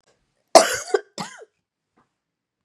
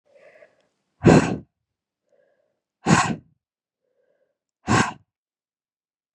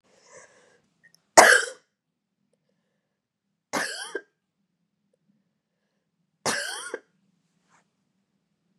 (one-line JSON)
{"cough_length": "2.6 s", "cough_amplitude": 32768, "cough_signal_mean_std_ratio": 0.22, "exhalation_length": "6.1 s", "exhalation_amplitude": 32071, "exhalation_signal_mean_std_ratio": 0.26, "three_cough_length": "8.8 s", "three_cough_amplitude": 32768, "three_cough_signal_mean_std_ratio": 0.19, "survey_phase": "beta (2021-08-13 to 2022-03-07)", "age": "45-64", "gender": "Female", "wearing_mask": "No", "symptom_runny_or_blocked_nose": true, "symptom_shortness_of_breath": true, "symptom_sore_throat": true, "symptom_headache": true, "symptom_change_to_sense_of_smell_or_taste": true, "symptom_onset": "4 days", "smoker_status": "Never smoked", "respiratory_condition_asthma": false, "respiratory_condition_other": false, "recruitment_source": "Test and Trace", "submission_delay": "1 day", "covid_test_result": "Positive", "covid_test_method": "RT-qPCR", "covid_ct_value": 15.0, "covid_ct_gene": "ORF1ab gene", "covid_ct_mean": 15.2, "covid_viral_load": "10000000 copies/ml", "covid_viral_load_category": "High viral load (>1M copies/ml)"}